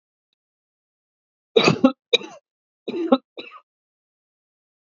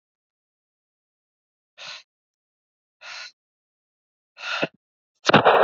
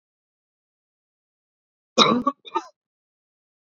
{"three_cough_length": "4.9 s", "three_cough_amplitude": 27758, "three_cough_signal_mean_std_ratio": 0.25, "exhalation_length": "5.6 s", "exhalation_amplitude": 27818, "exhalation_signal_mean_std_ratio": 0.23, "cough_length": "3.7 s", "cough_amplitude": 29960, "cough_signal_mean_std_ratio": 0.23, "survey_phase": "beta (2021-08-13 to 2022-03-07)", "age": "18-44", "gender": "Male", "wearing_mask": "No", "symptom_none": true, "smoker_status": "Never smoked", "respiratory_condition_asthma": false, "respiratory_condition_other": false, "recruitment_source": "REACT", "submission_delay": "6 days", "covid_test_result": "Negative", "covid_test_method": "RT-qPCR"}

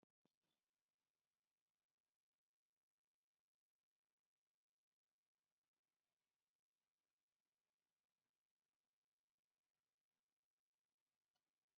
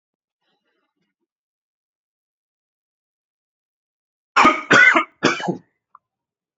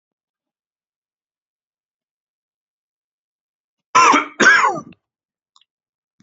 {"exhalation_length": "11.8 s", "exhalation_amplitude": 26, "exhalation_signal_mean_std_ratio": 0.17, "three_cough_length": "6.6 s", "three_cough_amplitude": 29118, "three_cough_signal_mean_std_ratio": 0.26, "cough_length": "6.2 s", "cough_amplitude": 29004, "cough_signal_mean_std_ratio": 0.26, "survey_phase": "alpha (2021-03-01 to 2021-08-12)", "age": "18-44", "gender": "Male", "wearing_mask": "No", "symptom_cough_any": true, "symptom_fever_high_temperature": true, "symptom_onset": "3 days", "smoker_status": "Never smoked", "respiratory_condition_asthma": false, "respiratory_condition_other": false, "recruitment_source": "Test and Trace", "submission_delay": "2 days", "covid_test_result": "Positive", "covid_test_method": "ePCR"}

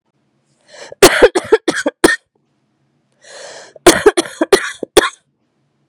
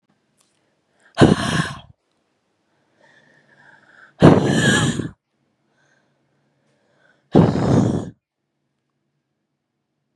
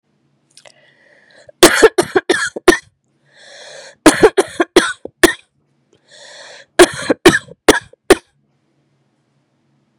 {"cough_length": "5.9 s", "cough_amplitude": 32768, "cough_signal_mean_std_ratio": 0.34, "exhalation_length": "10.2 s", "exhalation_amplitude": 32768, "exhalation_signal_mean_std_ratio": 0.32, "three_cough_length": "10.0 s", "three_cough_amplitude": 32768, "three_cough_signal_mean_std_ratio": 0.3, "survey_phase": "beta (2021-08-13 to 2022-03-07)", "age": "18-44", "gender": "Female", "wearing_mask": "No", "symptom_cough_any": true, "symptom_runny_or_blocked_nose": true, "symptom_shortness_of_breath": true, "symptom_sore_throat": true, "symptom_abdominal_pain": true, "symptom_fatigue": true, "symptom_fever_high_temperature": true, "symptom_headache": true, "symptom_change_to_sense_of_smell_or_taste": true, "symptom_loss_of_taste": true, "symptom_other": true, "symptom_onset": "3 days", "smoker_status": "Never smoked", "respiratory_condition_asthma": false, "respiratory_condition_other": false, "recruitment_source": "Test and Trace", "submission_delay": "1 day", "covid_test_result": "Positive", "covid_test_method": "RT-qPCR"}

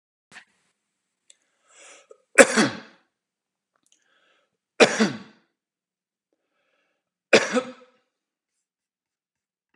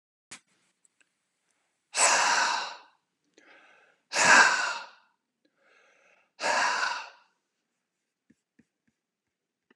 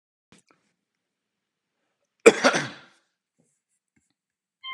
{"three_cough_length": "9.8 s", "three_cough_amplitude": 32768, "three_cough_signal_mean_std_ratio": 0.2, "exhalation_length": "9.8 s", "exhalation_amplitude": 17392, "exhalation_signal_mean_std_ratio": 0.34, "cough_length": "4.7 s", "cough_amplitude": 32515, "cough_signal_mean_std_ratio": 0.17, "survey_phase": "beta (2021-08-13 to 2022-03-07)", "age": "45-64", "gender": "Male", "wearing_mask": "No", "symptom_none": true, "smoker_status": "Never smoked", "respiratory_condition_asthma": false, "respiratory_condition_other": false, "recruitment_source": "REACT", "submission_delay": "5 days", "covid_test_result": "Negative", "covid_test_method": "RT-qPCR", "influenza_a_test_result": "Negative", "influenza_b_test_result": "Negative"}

